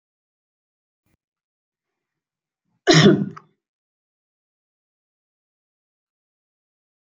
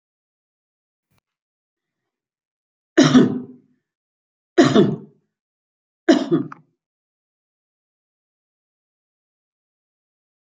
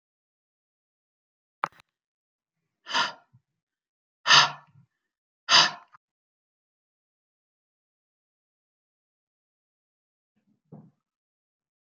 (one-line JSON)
{"cough_length": "7.1 s", "cough_amplitude": 27739, "cough_signal_mean_std_ratio": 0.18, "three_cough_length": "10.6 s", "three_cough_amplitude": 29635, "three_cough_signal_mean_std_ratio": 0.24, "exhalation_length": "11.9 s", "exhalation_amplitude": 22599, "exhalation_signal_mean_std_ratio": 0.17, "survey_phase": "beta (2021-08-13 to 2022-03-07)", "age": "65+", "gender": "Female", "wearing_mask": "No", "symptom_runny_or_blocked_nose": true, "smoker_status": "Never smoked", "respiratory_condition_asthma": false, "respiratory_condition_other": false, "recruitment_source": "REACT", "submission_delay": "2 days", "covid_test_result": "Negative", "covid_test_method": "RT-qPCR", "influenza_a_test_result": "Unknown/Void", "influenza_b_test_result": "Unknown/Void"}